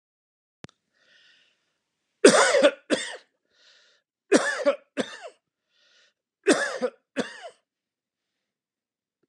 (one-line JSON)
{"three_cough_length": "9.3 s", "three_cough_amplitude": 30453, "three_cough_signal_mean_std_ratio": 0.29, "survey_phase": "beta (2021-08-13 to 2022-03-07)", "age": "65+", "gender": "Male", "wearing_mask": "No", "symptom_none": true, "smoker_status": "Never smoked", "respiratory_condition_asthma": false, "respiratory_condition_other": false, "recruitment_source": "REACT", "submission_delay": "2 days", "covid_test_result": "Negative", "covid_test_method": "RT-qPCR"}